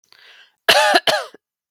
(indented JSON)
{
  "cough_length": "1.7 s",
  "cough_amplitude": 32768,
  "cough_signal_mean_std_ratio": 0.43,
  "survey_phase": "beta (2021-08-13 to 2022-03-07)",
  "age": "18-44",
  "gender": "Female",
  "wearing_mask": "No",
  "symptom_fatigue": true,
  "symptom_headache": true,
  "symptom_other": true,
  "smoker_status": "Never smoked",
  "respiratory_condition_asthma": false,
  "respiratory_condition_other": false,
  "recruitment_source": "Test and Trace",
  "submission_delay": "1 day",
  "covid_test_result": "Negative",
  "covid_test_method": "RT-qPCR"
}